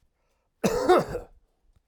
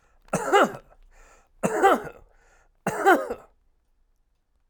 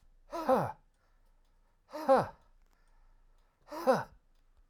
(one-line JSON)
{"cough_length": "1.9 s", "cough_amplitude": 12974, "cough_signal_mean_std_ratio": 0.39, "three_cough_length": "4.7 s", "three_cough_amplitude": 18551, "three_cough_signal_mean_std_ratio": 0.38, "exhalation_length": "4.7 s", "exhalation_amplitude": 6172, "exhalation_signal_mean_std_ratio": 0.34, "survey_phase": "alpha (2021-03-01 to 2021-08-12)", "age": "45-64", "gender": "Male", "wearing_mask": "No", "symptom_none": true, "smoker_status": "Ex-smoker", "recruitment_source": "REACT", "submission_delay": "0 days", "covid_test_result": "Negative", "covid_test_method": "RT-qPCR"}